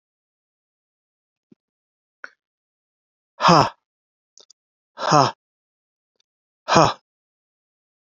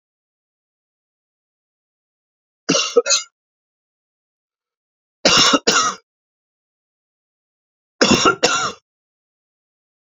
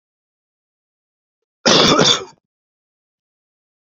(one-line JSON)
{"exhalation_length": "8.1 s", "exhalation_amplitude": 28277, "exhalation_signal_mean_std_ratio": 0.22, "three_cough_length": "10.2 s", "three_cough_amplitude": 30549, "three_cough_signal_mean_std_ratio": 0.3, "cough_length": "3.9 s", "cough_amplitude": 30677, "cough_signal_mean_std_ratio": 0.3, "survey_phase": "beta (2021-08-13 to 2022-03-07)", "age": "65+", "gender": "Male", "wearing_mask": "No", "symptom_none": true, "smoker_status": "Never smoked", "respiratory_condition_asthma": true, "respiratory_condition_other": false, "recruitment_source": "REACT", "submission_delay": "9 days", "covid_test_result": "Negative", "covid_test_method": "RT-qPCR"}